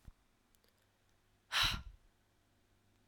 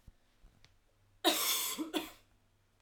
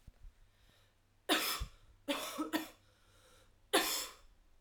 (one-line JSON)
{"exhalation_length": "3.1 s", "exhalation_amplitude": 3035, "exhalation_signal_mean_std_ratio": 0.27, "cough_length": "2.8 s", "cough_amplitude": 6411, "cough_signal_mean_std_ratio": 0.42, "three_cough_length": "4.6 s", "three_cough_amplitude": 6563, "three_cough_signal_mean_std_ratio": 0.42, "survey_phase": "alpha (2021-03-01 to 2021-08-12)", "age": "18-44", "gender": "Female", "wearing_mask": "No", "symptom_cough_any": true, "symptom_fatigue": true, "symptom_fever_high_temperature": true, "symptom_headache": true, "symptom_change_to_sense_of_smell_or_taste": true, "smoker_status": "Never smoked", "respiratory_condition_asthma": false, "respiratory_condition_other": false, "recruitment_source": "Test and Trace", "submission_delay": "2 days", "covid_test_result": "Positive", "covid_test_method": "RT-qPCR", "covid_ct_value": 17.9, "covid_ct_gene": "ORF1ab gene", "covid_ct_mean": 18.5, "covid_viral_load": "890000 copies/ml", "covid_viral_load_category": "Low viral load (10K-1M copies/ml)"}